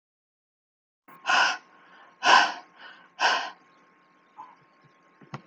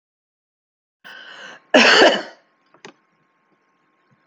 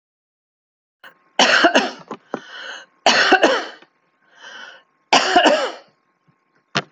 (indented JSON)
{
  "exhalation_length": "5.5 s",
  "exhalation_amplitude": 18414,
  "exhalation_signal_mean_std_ratio": 0.32,
  "cough_length": "4.3 s",
  "cough_amplitude": 31613,
  "cough_signal_mean_std_ratio": 0.28,
  "three_cough_length": "6.9 s",
  "three_cough_amplitude": 29576,
  "three_cough_signal_mean_std_ratio": 0.41,
  "survey_phase": "alpha (2021-03-01 to 2021-08-12)",
  "age": "45-64",
  "gender": "Female",
  "wearing_mask": "No",
  "symptom_none": true,
  "smoker_status": "Never smoked",
  "respiratory_condition_asthma": false,
  "respiratory_condition_other": false,
  "recruitment_source": "REACT",
  "submission_delay": "1 day",
  "covid_test_result": "Negative",
  "covid_test_method": "RT-qPCR"
}